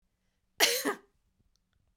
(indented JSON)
{
  "cough_length": "2.0 s",
  "cough_amplitude": 15623,
  "cough_signal_mean_std_ratio": 0.3,
  "survey_phase": "beta (2021-08-13 to 2022-03-07)",
  "age": "18-44",
  "gender": "Female",
  "wearing_mask": "No",
  "symptom_none": true,
  "smoker_status": "Never smoked",
  "respiratory_condition_asthma": true,
  "respiratory_condition_other": false,
  "recruitment_source": "Test and Trace",
  "submission_delay": "2 days",
  "covid_test_result": "Negative",
  "covid_test_method": "RT-qPCR"
}